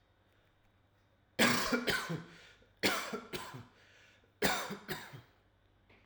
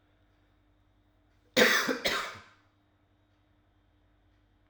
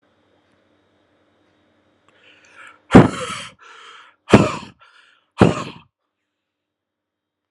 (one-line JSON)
{"three_cough_length": "6.1 s", "three_cough_amplitude": 7332, "three_cough_signal_mean_std_ratio": 0.43, "cough_length": "4.7 s", "cough_amplitude": 12646, "cough_signal_mean_std_ratio": 0.29, "exhalation_length": "7.5 s", "exhalation_amplitude": 32768, "exhalation_signal_mean_std_ratio": 0.21, "survey_phase": "alpha (2021-03-01 to 2021-08-12)", "age": "18-44", "gender": "Male", "wearing_mask": "No", "symptom_change_to_sense_of_smell_or_taste": true, "symptom_onset": "3 days", "smoker_status": "Never smoked", "respiratory_condition_asthma": false, "respiratory_condition_other": false, "recruitment_source": "Test and Trace", "submission_delay": "1 day", "covid_test_result": "Positive", "covid_test_method": "RT-qPCR", "covid_ct_value": 27.3, "covid_ct_gene": "S gene", "covid_ct_mean": 27.7, "covid_viral_load": "840 copies/ml", "covid_viral_load_category": "Minimal viral load (< 10K copies/ml)"}